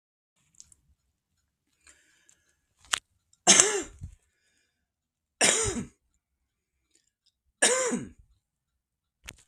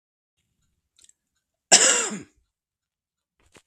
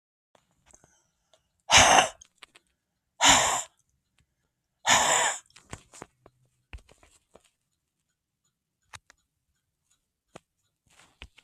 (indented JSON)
{
  "three_cough_length": "9.5 s",
  "three_cough_amplitude": 32768,
  "three_cough_signal_mean_std_ratio": 0.25,
  "cough_length": "3.7 s",
  "cough_amplitude": 32768,
  "cough_signal_mean_std_ratio": 0.24,
  "exhalation_length": "11.4 s",
  "exhalation_amplitude": 21576,
  "exhalation_signal_mean_std_ratio": 0.26,
  "survey_phase": "beta (2021-08-13 to 2022-03-07)",
  "age": "45-64",
  "gender": "Female",
  "wearing_mask": "No",
  "symptom_none": true,
  "smoker_status": "Current smoker (11 or more cigarettes per day)",
  "respiratory_condition_asthma": false,
  "respiratory_condition_other": false,
  "recruitment_source": "REACT",
  "submission_delay": "1 day",
  "covid_test_result": "Negative",
  "covid_test_method": "RT-qPCR",
  "influenza_a_test_result": "Negative",
  "influenza_b_test_result": "Negative"
}